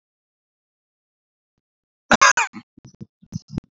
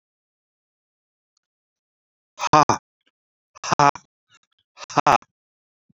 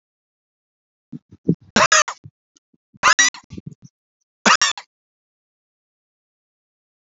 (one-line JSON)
{"cough_length": "3.8 s", "cough_amplitude": 32767, "cough_signal_mean_std_ratio": 0.21, "exhalation_length": "6.0 s", "exhalation_amplitude": 30070, "exhalation_signal_mean_std_ratio": 0.2, "three_cough_length": "7.1 s", "three_cough_amplitude": 29575, "three_cough_signal_mean_std_ratio": 0.26, "survey_phase": "alpha (2021-03-01 to 2021-08-12)", "age": "65+", "gender": "Male", "wearing_mask": "No", "symptom_none": true, "smoker_status": "Current smoker (1 to 10 cigarettes per day)", "respiratory_condition_asthma": false, "respiratory_condition_other": false, "recruitment_source": "REACT", "submission_delay": "2 days", "covid_test_result": "Negative", "covid_test_method": "RT-qPCR"}